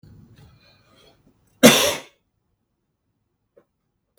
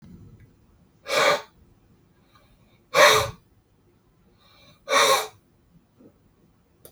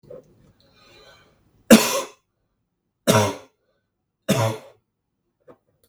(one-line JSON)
{"cough_length": "4.2 s", "cough_amplitude": 32768, "cough_signal_mean_std_ratio": 0.2, "exhalation_length": "6.9 s", "exhalation_amplitude": 31199, "exhalation_signal_mean_std_ratio": 0.31, "three_cough_length": "5.9 s", "three_cough_amplitude": 32768, "three_cough_signal_mean_std_ratio": 0.26, "survey_phase": "beta (2021-08-13 to 2022-03-07)", "age": "18-44", "gender": "Male", "wearing_mask": "No", "symptom_cough_any": true, "symptom_runny_or_blocked_nose": true, "symptom_sore_throat": true, "symptom_change_to_sense_of_smell_or_taste": true, "smoker_status": "Never smoked", "respiratory_condition_asthma": false, "respiratory_condition_other": false, "recruitment_source": "Test and Trace", "submission_delay": "2 days", "covid_test_result": "Positive", "covid_test_method": "RT-qPCR", "covid_ct_value": 18.7, "covid_ct_gene": "N gene", "covid_ct_mean": 19.0, "covid_viral_load": "580000 copies/ml", "covid_viral_load_category": "Low viral load (10K-1M copies/ml)"}